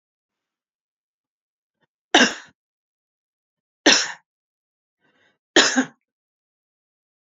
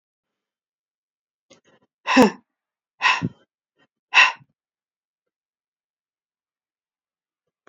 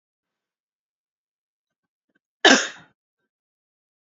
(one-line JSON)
{"three_cough_length": "7.3 s", "three_cough_amplitude": 32297, "three_cough_signal_mean_std_ratio": 0.22, "exhalation_length": "7.7 s", "exhalation_amplitude": 27522, "exhalation_signal_mean_std_ratio": 0.2, "cough_length": "4.0 s", "cough_amplitude": 28796, "cough_signal_mean_std_ratio": 0.17, "survey_phase": "beta (2021-08-13 to 2022-03-07)", "age": "45-64", "gender": "Female", "wearing_mask": "No", "symptom_none": true, "smoker_status": "Never smoked", "respiratory_condition_asthma": false, "respiratory_condition_other": false, "recruitment_source": "REACT", "submission_delay": "1 day", "covid_test_result": "Negative", "covid_test_method": "RT-qPCR", "influenza_a_test_result": "Negative", "influenza_b_test_result": "Negative"}